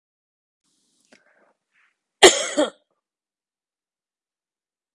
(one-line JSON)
{"cough_length": "4.9 s", "cough_amplitude": 32768, "cough_signal_mean_std_ratio": 0.17, "survey_phase": "beta (2021-08-13 to 2022-03-07)", "age": "45-64", "gender": "Female", "wearing_mask": "No", "symptom_none": true, "smoker_status": "Never smoked", "respiratory_condition_asthma": false, "respiratory_condition_other": false, "recruitment_source": "REACT", "submission_delay": "2 days", "covid_test_result": "Negative", "covid_test_method": "RT-qPCR"}